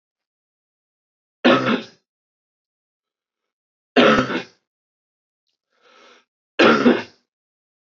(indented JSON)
{
  "three_cough_length": "7.9 s",
  "three_cough_amplitude": 25520,
  "three_cough_signal_mean_std_ratio": 0.3,
  "survey_phase": "alpha (2021-03-01 to 2021-08-12)",
  "age": "18-44",
  "gender": "Male",
  "wearing_mask": "No",
  "symptom_cough_any": true,
  "symptom_fever_high_temperature": true,
  "symptom_onset": "2 days",
  "smoker_status": "Never smoked",
  "respiratory_condition_asthma": false,
  "respiratory_condition_other": false,
  "recruitment_source": "Test and Trace",
  "submission_delay": "2 days",
  "covid_test_result": "Positive",
  "covid_test_method": "RT-qPCR",
  "covid_ct_value": 16.5,
  "covid_ct_gene": "ORF1ab gene",
  "covid_ct_mean": 17.8,
  "covid_viral_load": "1500000 copies/ml",
  "covid_viral_load_category": "High viral load (>1M copies/ml)"
}